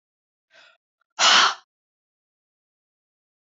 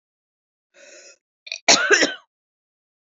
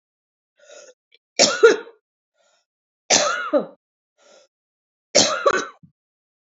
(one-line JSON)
{"exhalation_length": "3.6 s", "exhalation_amplitude": 22522, "exhalation_signal_mean_std_ratio": 0.24, "cough_length": "3.1 s", "cough_amplitude": 32768, "cough_signal_mean_std_ratio": 0.29, "three_cough_length": "6.6 s", "three_cough_amplitude": 32768, "three_cough_signal_mean_std_ratio": 0.32, "survey_phase": "beta (2021-08-13 to 2022-03-07)", "age": "45-64", "gender": "Female", "wearing_mask": "No", "symptom_cough_any": true, "symptom_runny_or_blocked_nose": true, "symptom_sore_throat": true, "symptom_headache": true, "smoker_status": "Never smoked", "respiratory_condition_asthma": false, "respiratory_condition_other": false, "recruitment_source": "Test and Trace", "submission_delay": "2 days", "covid_test_result": "Positive", "covid_test_method": "RT-qPCR", "covid_ct_value": 30.4, "covid_ct_gene": "N gene"}